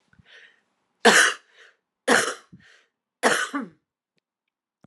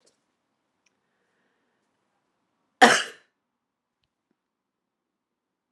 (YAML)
three_cough_length: 4.9 s
three_cough_amplitude: 24637
three_cough_signal_mean_std_ratio: 0.31
cough_length: 5.7 s
cough_amplitude: 31405
cough_signal_mean_std_ratio: 0.14
survey_phase: alpha (2021-03-01 to 2021-08-12)
age: 45-64
gender: Female
wearing_mask: 'No'
symptom_cough_any: true
symptom_fatigue: true
symptom_headache: true
symptom_change_to_sense_of_smell_or_taste: true
smoker_status: Never smoked
respiratory_condition_asthma: true
respiratory_condition_other: false
recruitment_source: Test and Trace
submission_delay: 1 day
covid_test_result: Positive
covid_test_method: RT-qPCR
covid_ct_value: 15.3
covid_ct_gene: ORF1ab gene
covid_ct_mean: 15.7
covid_viral_load: 7100000 copies/ml
covid_viral_load_category: High viral load (>1M copies/ml)